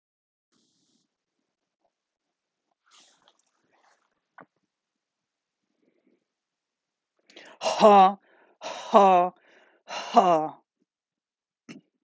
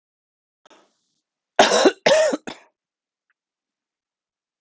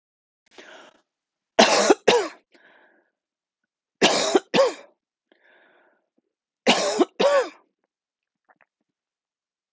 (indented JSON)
{
  "exhalation_length": "12.0 s",
  "exhalation_amplitude": 24932,
  "exhalation_signal_mean_std_ratio": 0.24,
  "cough_length": "4.6 s",
  "cough_amplitude": 32768,
  "cough_signal_mean_std_ratio": 0.29,
  "three_cough_length": "9.7 s",
  "three_cough_amplitude": 30024,
  "three_cough_signal_mean_std_ratio": 0.33,
  "survey_phase": "beta (2021-08-13 to 2022-03-07)",
  "age": "45-64",
  "gender": "Female",
  "wearing_mask": "No",
  "symptom_cough_any": true,
  "symptom_runny_or_blocked_nose": true,
  "symptom_sore_throat": true,
  "symptom_other": true,
  "smoker_status": "Never smoked",
  "respiratory_condition_asthma": true,
  "respiratory_condition_other": false,
  "recruitment_source": "Test and Trace",
  "submission_delay": "1 day",
  "covid_test_result": "Positive",
  "covid_test_method": "RT-qPCR",
  "covid_ct_value": 26.9,
  "covid_ct_gene": "ORF1ab gene",
  "covid_ct_mean": 27.9,
  "covid_viral_load": "700 copies/ml",
  "covid_viral_load_category": "Minimal viral load (< 10K copies/ml)"
}